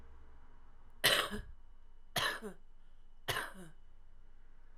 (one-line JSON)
{"three_cough_length": "4.8 s", "three_cough_amplitude": 10599, "three_cough_signal_mean_std_ratio": 0.55, "survey_phase": "alpha (2021-03-01 to 2021-08-12)", "age": "18-44", "gender": "Female", "wearing_mask": "No", "symptom_cough_any": true, "symptom_onset": "8 days", "smoker_status": "Ex-smoker", "respiratory_condition_asthma": false, "respiratory_condition_other": false, "recruitment_source": "REACT", "submission_delay": "1 day", "covid_test_result": "Negative", "covid_test_method": "RT-qPCR"}